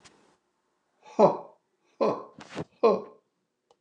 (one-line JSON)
{"exhalation_length": "3.8 s", "exhalation_amplitude": 15763, "exhalation_signal_mean_std_ratio": 0.3, "survey_phase": "beta (2021-08-13 to 2022-03-07)", "age": "65+", "gender": "Male", "wearing_mask": "No", "symptom_none": true, "smoker_status": "Never smoked", "respiratory_condition_asthma": false, "respiratory_condition_other": false, "recruitment_source": "REACT", "submission_delay": "2 days", "covid_test_result": "Negative", "covid_test_method": "RT-qPCR", "influenza_a_test_result": "Negative", "influenza_b_test_result": "Negative"}